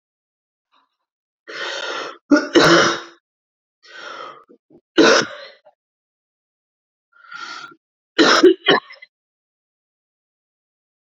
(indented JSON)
{
  "three_cough_length": "11.0 s",
  "three_cough_amplitude": 30440,
  "three_cough_signal_mean_std_ratio": 0.32,
  "survey_phase": "beta (2021-08-13 to 2022-03-07)",
  "age": "18-44",
  "gender": "Female",
  "wearing_mask": "No",
  "symptom_cough_any": true,
  "symptom_runny_or_blocked_nose": true,
  "symptom_shortness_of_breath": true,
  "symptom_sore_throat": true,
  "symptom_diarrhoea": true,
  "symptom_fever_high_temperature": true,
  "symptom_headache": true,
  "symptom_change_to_sense_of_smell_or_taste": true,
  "symptom_onset": "3 days",
  "smoker_status": "Current smoker (e-cigarettes or vapes only)",
  "respiratory_condition_asthma": false,
  "respiratory_condition_other": false,
  "recruitment_source": "Test and Trace",
  "submission_delay": "2 days",
  "covid_test_result": "Positive",
  "covid_test_method": "RT-qPCR",
  "covid_ct_value": 15.5,
  "covid_ct_gene": "ORF1ab gene",
  "covid_ct_mean": 15.9,
  "covid_viral_load": "6100000 copies/ml",
  "covid_viral_load_category": "High viral load (>1M copies/ml)"
}